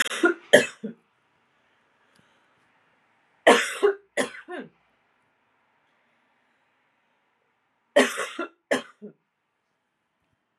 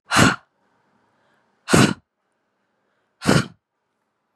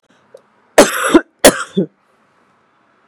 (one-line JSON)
{"three_cough_length": "10.6 s", "three_cough_amplitude": 31465, "three_cough_signal_mean_std_ratio": 0.25, "exhalation_length": "4.4 s", "exhalation_amplitude": 32521, "exhalation_signal_mean_std_ratio": 0.3, "cough_length": "3.1 s", "cough_amplitude": 32768, "cough_signal_mean_std_ratio": 0.32, "survey_phase": "beta (2021-08-13 to 2022-03-07)", "age": "18-44", "gender": "Female", "wearing_mask": "No", "symptom_cough_any": true, "symptom_fatigue": true, "smoker_status": "Never smoked", "respiratory_condition_asthma": false, "respiratory_condition_other": false, "recruitment_source": "Test and Trace", "submission_delay": "1 day", "covid_test_result": "Positive", "covid_test_method": "RT-qPCR", "covid_ct_value": 31.4, "covid_ct_gene": "N gene"}